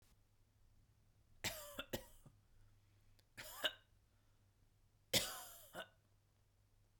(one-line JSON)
{"three_cough_length": "7.0 s", "three_cough_amplitude": 2946, "three_cough_signal_mean_std_ratio": 0.31, "survey_phase": "beta (2021-08-13 to 2022-03-07)", "age": "45-64", "gender": "Female", "wearing_mask": "No", "symptom_none": true, "smoker_status": "Never smoked", "respiratory_condition_asthma": false, "respiratory_condition_other": false, "recruitment_source": "REACT", "submission_delay": "2 days", "covid_test_result": "Negative", "covid_test_method": "RT-qPCR", "influenza_a_test_result": "Negative", "influenza_b_test_result": "Negative"}